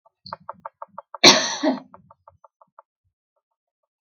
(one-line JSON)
{"cough_length": "4.2 s", "cough_amplitude": 32768, "cough_signal_mean_std_ratio": 0.23, "survey_phase": "beta (2021-08-13 to 2022-03-07)", "age": "65+", "gender": "Female", "wearing_mask": "No", "symptom_none": true, "smoker_status": "Never smoked", "respiratory_condition_asthma": false, "respiratory_condition_other": false, "recruitment_source": "REACT", "submission_delay": "3 days", "covid_test_result": "Negative", "covid_test_method": "RT-qPCR"}